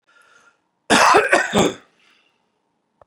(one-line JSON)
{"cough_length": "3.1 s", "cough_amplitude": 32455, "cough_signal_mean_std_ratio": 0.38, "survey_phase": "beta (2021-08-13 to 2022-03-07)", "age": "45-64", "gender": "Male", "wearing_mask": "No", "symptom_cough_any": true, "symptom_runny_or_blocked_nose": true, "smoker_status": "Ex-smoker", "respiratory_condition_asthma": false, "respiratory_condition_other": false, "recruitment_source": "Test and Trace", "submission_delay": "2 days", "covid_test_result": "Positive", "covid_test_method": "LFT"}